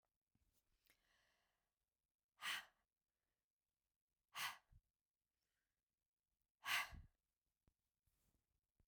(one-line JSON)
{"exhalation_length": "8.9 s", "exhalation_amplitude": 1047, "exhalation_signal_mean_std_ratio": 0.22, "survey_phase": "beta (2021-08-13 to 2022-03-07)", "age": "65+", "gender": "Female", "wearing_mask": "No", "symptom_diarrhoea": true, "symptom_onset": "12 days", "smoker_status": "Never smoked", "respiratory_condition_asthma": false, "respiratory_condition_other": false, "recruitment_source": "REACT", "submission_delay": "3 days", "covid_test_result": "Negative", "covid_test_method": "RT-qPCR"}